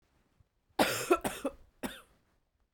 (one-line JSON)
{"cough_length": "2.7 s", "cough_amplitude": 7879, "cough_signal_mean_std_ratio": 0.34, "survey_phase": "beta (2021-08-13 to 2022-03-07)", "age": "18-44", "gender": "Female", "wearing_mask": "No", "symptom_runny_or_blocked_nose": true, "symptom_fatigue": true, "symptom_headache": true, "symptom_onset": "1 day", "smoker_status": "Never smoked", "respiratory_condition_asthma": false, "respiratory_condition_other": false, "recruitment_source": "Test and Trace", "submission_delay": "1 day", "covid_test_result": "Positive", "covid_test_method": "LAMP"}